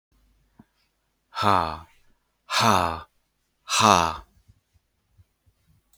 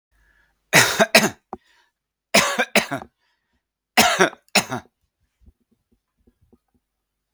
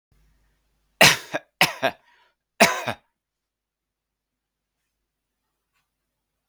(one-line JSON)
{"exhalation_length": "6.0 s", "exhalation_amplitude": 31403, "exhalation_signal_mean_std_ratio": 0.31, "three_cough_length": "7.3 s", "three_cough_amplitude": 32768, "three_cough_signal_mean_std_ratio": 0.31, "cough_length": "6.5 s", "cough_amplitude": 32768, "cough_signal_mean_std_ratio": 0.21, "survey_phase": "beta (2021-08-13 to 2022-03-07)", "age": "45-64", "gender": "Male", "wearing_mask": "No", "symptom_none": true, "symptom_onset": "12 days", "smoker_status": "Never smoked", "respiratory_condition_asthma": false, "respiratory_condition_other": false, "recruitment_source": "REACT", "submission_delay": "1 day", "covid_test_result": "Negative", "covid_test_method": "RT-qPCR", "influenza_a_test_result": "Negative", "influenza_b_test_result": "Negative"}